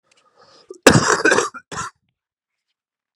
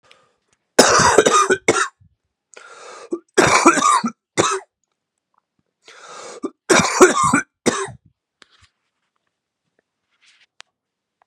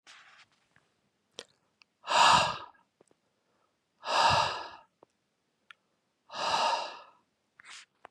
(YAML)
cough_length: 3.2 s
cough_amplitude: 32768
cough_signal_mean_std_ratio: 0.33
three_cough_length: 11.3 s
three_cough_amplitude: 32768
three_cough_signal_mean_std_ratio: 0.38
exhalation_length: 8.1 s
exhalation_amplitude: 11031
exhalation_signal_mean_std_ratio: 0.35
survey_phase: beta (2021-08-13 to 2022-03-07)
age: 18-44
gender: Male
wearing_mask: 'No'
symptom_cough_any: true
symptom_headache: true
symptom_other: true
symptom_onset: 3 days
smoker_status: Ex-smoker
respiratory_condition_asthma: false
respiratory_condition_other: false
recruitment_source: Test and Trace
submission_delay: 2 days
covid_test_result: Positive
covid_test_method: RT-qPCR
covid_ct_value: 20.6
covid_ct_gene: N gene